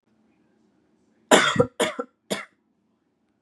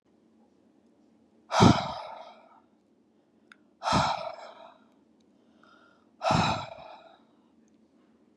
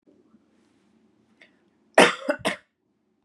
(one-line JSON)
{"three_cough_length": "3.4 s", "three_cough_amplitude": 29894, "three_cough_signal_mean_std_ratio": 0.29, "exhalation_length": "8.4 s", "exhalation_amplitude": 21065, "exhalation_signal_mean_std_ratio": 0.3, "cough_length": "3.2 s", "cough_amplitude": 31199, "cough_signal_mean_std_ratio": 0.22, "survey_phase": "beta (2021-08-13 to 2022-03-07)", "age": "18-44", "gender": "Female", "wearing_mask": "No", "symptom_none": true, "smoker_status": "Never smoked", "respiratory_condition_asthma": false, "respiratory_condition_other": false, "recruitment_source": "REACT", "submission_delay": "1 day", "covid_test_result": "Negative", "covid_test_method": "RT-qPCR"}